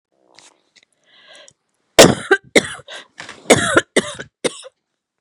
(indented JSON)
{
  "cough_length": "5.2 s",
  "cough_amplitude": 32768,
  "cough_signal_mean_std_ratio": 0.29,
  "survey_phase": "beta (2021-08-13 to 2022-03-07)",
  "age": "45-64",
  "gender": "Female",
  "wearing_mask": "No",
  "symptom_runny_or_blocked_nose": true,
  "symptom_fatigue": true,
  "symptom_headache": true,
  "smoker_status": "Never smoked",
  "respiratory_condition_asthma": false,
  "respiratory_condition_other": true,
  "recruitment_source": "REACT",
  "submission_delay": "1 day",
  "covid_test_result": "Negative",
  "covid_test_method": "RT-qPCR",
  "influenza_a_test_result": "Negative",
  "influenza_b_test_result": "Negative"
}